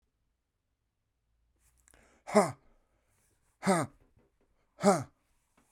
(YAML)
exhalation_length: 5.7 s
exhalation_amplitude: 11145
exhalation_signal_mean_std_ratio: 0.24
survey_phase: beta (2021-08-13 to 2022-03-07)
age: 45-64
gender: Male
wearing_mask: 'No'
symptom_cough_any: true
symptom_sore_throat: true
symptom_fatigue: true
symptom_headache: true
smoker_status: Ex-smoker
respiratory_condition_asthma: false
respiratory_condition_other: false
recruitment_source: Test and Trace
submission_delay: 2 days
covid_test_result: Positive
covid_test_method: RT-qPCR
covid_ct_value: 20.7
covid_ct_gene: ORF1ab gene
covid_ct_mean: 21.3
covid_viral_load: 100000 copies/ml
covid_viral_load_category: Low viral load (10K-1M copies/ml)